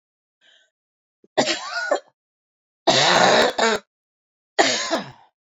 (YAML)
three_cough_length: 5.5 s
three_cough_amplitude: 25276
three_cough_signal_mean_std_ratio: 0.45
survey_phase: beta (2021-08-13 to 2022-03-07)
age: 45-64
gender: Female
wearing_mask: 'No'
symptom_cough_any: true
symptom_new_continuous_cough: true
symptom_shortness_of_breath: true
symptom_diarrhoea: true
symptom_fatigue: true
symptom_headache: true
symptom_change_to_sense_of_smell_or_taste: true
symptom_onset: 5 days
smoker_status: Never smoked
respiratory_condition_asthma: false
respiratory_condition_other: true
recruitment_source: Test and Trace
submission_delay: 1 day
covid_test_result: Positive
covid_test_method: RT-qPCR
covid_ct_value: 35.9
covid_ct_gene: N gene
covid_ct_mean: 36.4
covid_viral_load: 1.1 copies/ml
covid_viral_load_category: Minimal viral load (< 10K copies/ml)